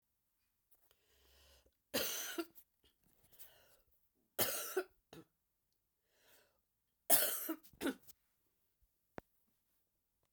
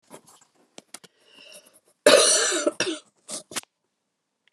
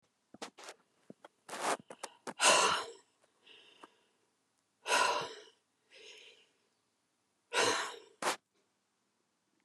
{"three_cough_length": "10.3 s", "three_cough_amplitude": 7563, "three_cough_signal_mean_std_ratio": 0.27, "cough_length": "4.5 s", "cough_amplitude": 27339, "cough_signal_mean_std_ratio": 0.32, "exhalation_length": "9.6 s", "exhalation_amplitude": 8952, "exhalation_signal_mean_std_ratio": 0.33, "survey_phase": "beta (2021-08-13 to 2022-03-07)", "age": "65+", "gender": "Female", "wearing_mask": "No", "symptom_cough_any": true, "symptom_runny_or_blocked_nose": true, "symptom_onset": "6 days", "smoker_status": "Ex-smoker", "respiratory_condition_asthma": false, "respiratory_condition_other": false, "recruitment_source": "Test and Trace", "submission_delay": "2 days", "covid_test_result": "Positive", "covid_test_method": "ePCR"}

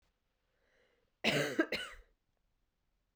{"cough_length": "3.2 s", "cough_amplitude": 4983, "cough_signal_mean_std_ratio": 0.32, "survey_phase": "beta (2021-08-13 to 2022-03-07)", "age": "18-44", "gender": "Female", "wearing_mask": "No", "symptom_cough_any": true, "symptom_runny_or_blocked_nose": true, "symptom_sore_throat": true, "symptom_headache": true, "symptom_onset": "3 days", "smoker_status": "Never smoked", "respiratory_condition_asthma": false, "respiratory_condition_other": false, "recruitment_source": "Test and Trace", "submission_delay": "2 days", "covid_test_result": "Positive", "covid_test_method": "RT-qPCR", "covid_ct_value": 19.1, "covid_ct_gene": "ORF1ab gene", "covid_ct_mean": 19.3, "covid_viral_load": "460000 copies/ml", "covid_viral_load_category": "Low viral load (10K-1M copies/ml)"}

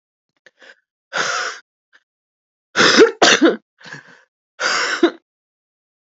{"exhalation_length": "6.1 s", "exhalation_amplitude": 30495, "exhalation_signal_mean_std_ratio": 0.37, "survey_phase": "beta (2021-08-13 to 2022-03-07)", "age": "18-44", "gender": "Female", "wearing_mask": "No", "symptom_cough_any": true, "symptom_new_continuous_cough": true, "symptom_runny_or_blocked_nose": true, "symptom_shortness_of_breath": true, "symptom_sore_throat": true, "symptom_fatigue": true, "symptom_headache": true, "symptom_change_to_sense_of_smell_or_taste": true, "smoker_status": "Current smoker (11 or more cigarettes per day)", "respiratory_condition_asthma": false, "respiratory_condition_other": false, "recruitment_source": "Test and Trace", "submission_delay": "1 day", "covid_test_result": "Positive", "covid_test_method": "RT-qPCR", "covid_ct_value": 23.0, "covid_ct_gene": "N gene"}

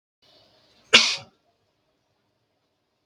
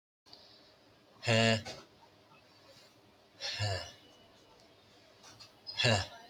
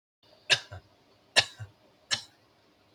{"cough_length": "3.1 s", "cough_amplitude": 32768, "cough_signal_mean_std_ratio": 0.19, "exhalation_length": "6.3 s", "exhalation_amplitude": 8325, "exhalation_signal_mean_std_ratio": 0.36, "three_cough_length": "2.9 s", "three_cough_amplitude": 15739, "three_cough_signal_mean_std_ratio": 0.23, "survey_phase": "beta (2021-08-13 to 2022-03-07)", "age": "18-44", "gender": "Male", "wearing_mask": "No", "symptom_prefer_not_to_say": true, "smoker_status": "Prefer not to say", "recruitment_source": "REACT", "submission_delay": "5 days", "covid_test_result": "Negative", "covid_test_method": "RT-qPCR", "influenza_a_test_result": "Negative", "influenza_b_test_result": "Negative"}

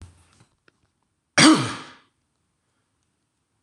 {"cough_length": "3.6 s", "cough_amplitude": 26027, "cough_signal_mean_std_ratio": 0.24, "survey_phase": "beta (2021-08-13 to 2022-03-07)", "age": "45-64", "gender": "Male", "wearing_mask": "No", "symptom_fatigue": true, "symptom_onset": "9 days", "smoker_status": "Ex-smoker", "respiratory_condition_asthma": false, "respiratory_condition_other": false, "recruitment_source": "REACT", "submission_delay": "2 days", "covid_test_result": "Negative", "covid_test_method": "RT-qPCR", "influenza_a_test_result": "Unknown/Void", "influenza_b_test_result": "Unknown/Void"}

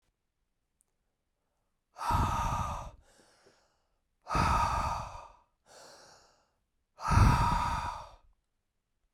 {"exhalation_length": "9.1 s", "exhalation_amplitude": 9219, "exhalation_signal_mean_std_ratio": 0.42, "survey_phase": "beta (2021-08-13 to 2022-03-07)", "age": "18-44", "gender": "Male", "wearing_mask": "No", "symptom_cough_any": true, "symptom_runny_or_blocked_nose": true, "symptom_fatigue": true, "symptom_headache": true, "symptom_onset": "4 days", "smoker_status": "Ex-smoker", "respiratory_condition_asthma": true, "respiratory_condition_other": false, "recruitment_source": "Test and Trace", "submission_delay": "2 days", "covid_test_result": "Positive", "covid_test_method": "RT-qPCR", "covid_ct_value": 12.9, "covid_ct_gene": "ORF1ab gene", "covid_ct_mean": 13.3, "covid_viral_load": "43000000 copies/ml", "covid_viral_load_category": "High viral load (>1M copies/ml)"}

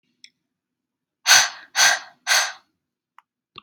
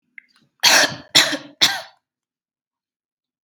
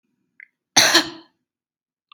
{"exhalation_length": "3.6 s", "exhalation_amplitude": 32768, "exhalation_signal_mean_std_ratio": 0.33, "three_cough_length": "3.4 s", "three_cough_amplitude": 32768, "three_cough_signal_mean_std_ratio": 0.33, "cough_length": "2.1 s", "cough_amplitude": 32768, "cough_signal_mean_std_ratio": 0.29, "survey_phase": "beta (2021-08-13 to 2022-03-07)", "age": "18-44", "gender": "Female", "wearing_mask": "No", "symptom_runny_or_blocked_nose": true, "smoker_status": "Never smoked", "respiratory_condition_asthma": false, "respiratory_condition_other": false, "recruitment_source": "REACT", "submission_delay": "1 day", "covid_test_result": "Negative", "covid_test_method": "RT-qPCR", "influenza_a_test_result": "Unknown/Void", "influenza_b_test_result": "Unknown/Void"}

